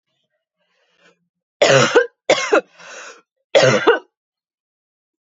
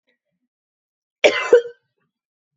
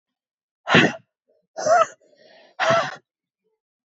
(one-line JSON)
{"three_cough_length": "5.4 s", "three_cough_amplitude": 32768, "three_cough_signal_mean_std_ratio": 0.37, "cough_length": "2.6 s", "cough_amplitude": 32768, "cough_signal_mean_std_ratio": 0.25, "exhalation_length": "3.8 s", "exhalation_amplitude": 29927, "exhalation_signal_mean_std_ratio": 0.36, "survey_phase": "beta (2021-08-13 to 2022-03-07)", "age": "18-44", "gender": "Female", "wearing_mask": "No", "symptom_cough_any": true, "symptom_shortness_of_breath": true, "symptom_sore_throat": true, "symptom_fatigue": true, "symptom_headache": true, "symptom_onset": "6 days", "smoker_status": "Never smoked", "respiratory_condition_asthma": true, "respiratory_condition_other": false, "recruitment_source": "Test and Trace", "submission_delay": "2 days", "covid_test_result": "Positive", "covid_test_method": "RT-qPCR", "covid_ct_value": 22.8, "covid_ct_gene": "ORF1ab gene"}